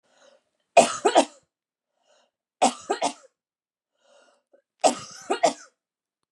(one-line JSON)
{"three_cough_length": "6.3 s", "three_cough_amplitude": 27142, "three_cough_signal_mean_std_ratio": 0.27, "survey_phase": "beta (2021-08-13 to 2022-03-07)", "age": "18-44", "gender": "Female", "wearing_mask": "No", "symptom_cough_any": true, "symptom_abdominal_pain": true, "symptom_onset": "12 days", "smoker_status": "Ex-smoker", "respiratory_condition_asthma": false, "respiratory_condition_other": false, "recruitment_source": "REACT", "submission_delay": "3 days", "covid_test_result": "Negative", "covid_test_method": "RT-qPCR", "influenza_a_test_result": "Unknown/Void", "influenza_b_test_result": "Unknown/Void"}